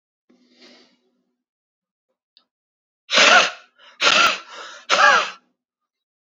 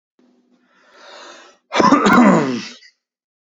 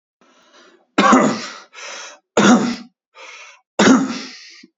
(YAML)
exhalation_length: 6.3 s
exhalation_amplitude: 29522
exhalation_signal_mean_std_ratio: 0.34
cough_length: 3.5 s
cough_amplitude: 32767
cough_signal_mean_std_ratio: 0.42
three_cough_length: 4.8 s
three_cough_amplitude: 32768
three_cough_signal_mean_std_ratio: 0.44
survey_phase: beta (2021-08-13 to 2022-03-07)
age: 18-44
gender: Male
wearing_mask: 'No'
symptom_none: true
smoker_status: Never smoked
respiratory_condition_asthma: false
respiratory_condition_other: false
recruitment_source: REACT
submission_delay: 0 days
covid_test_result: Negative
covid_test_method: RT-qPCR
influenza_a_test_result: Negative
influenza_b_test_result: Negative